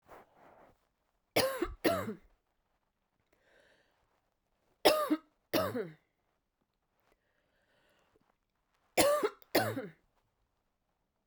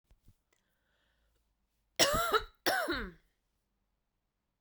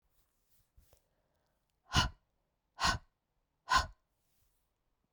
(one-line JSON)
{"three_cough_length": "11.3 s", "three_cough_amplitude": 12360, "three_cough_signal_mean_std_ratio": 0.31, "cough_length": "4.6 s", "cough_amplitude": 10316, "cough_signal_mean_std_ratio": 0.33, "exhalation_length": "5.1 s", "exhalation_amplitude": 5499, "exhalation_signal_mean_std_ratio": 0.24, "survey_phase": "beta (2021-08-13 to 2022-03-07)", "age": "18-44", "gender": "Female", "wearing_mask": "No", "symptom_cough_any": true, "symptom_runny_or_blocked_nose": true, "symptom_sore_throat": true, "symptom_fatigue": true, "symptom_fever_high_temperature": true, "symptom_headache": true, "symptom_onset": "3 days", "smoker_status": "Ex-smoker", "respiratory_condition_asthma": false, "respiratory_condition_other": false, "recruitment_source": "Test and Trace", "submission_delay": "2 days", "covid_test_result": "Positive", "covid_test_method": "RT-qPCR", "covid_ct_value": 16.1, "covid_ct_gene": "ORF1ab gene", "covid_ct_mean": 16.5, "covid_viral_load": "3900000 copies/ml", "covid_viral_load_category": "High viral load (>1M copies/ml)"}